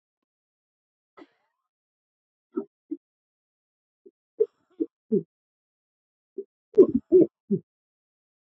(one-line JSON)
{"three_cough_length": "8.4 s", "three_cough_amplitude": 17749, "three_cough_signal_mean_std_ratio": 0.2, "survey_phase": "alpha (2021-03-01 to 2021-08-12)", "age": "45-64", "gender": "Male", "wearing_mask": "No", "symptom_cough_any": true, "symptom_shortness_of_breath": true, "symptom_fatigue": true, "symptom_headache": true, "smoker_status": "Prefer not to say", "respiratory_condition_asthma": true, "respiratory_condition_other": false, "recruitment_source": "Test and Trace", "submission_delay": "2 days", "covid_test_result": "Positive", "covid_test_method": "RT-qPCR", "covid_ct_value": 11.1, "covid_ct_gene": "ORF1ab gene", "covid_ct_mean": 11.4, "covid_viral_load": "180000000 copies/ml", "covid_viral_load_category": "High viral load (>1M copies/ml)"}